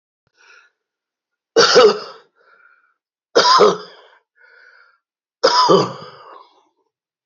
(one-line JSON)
{"three_cough_length": "7.3 s", "three_cough_amplitude": 32768, "three_cough_signal_mean_std_ratio": 0.35, "survey_phase": "beta (2021-08-13 to 2022-03-07)", "age": "65+", "gender": "Male", "wearing_mask": "No", "symptom_cough_any": true, "smoker_status": "Ex-smoker", "respiratory_condition_asthma": false, "respiratory_condition_other": true, "recruitment_source": "REACT", "submission_delay": "1 day", "covid_test_result": "Negative", "covid_test_method": "RT-qPCR", "influenza_a_test_result": "Negative", "influenza_b_test_result": "Negative"}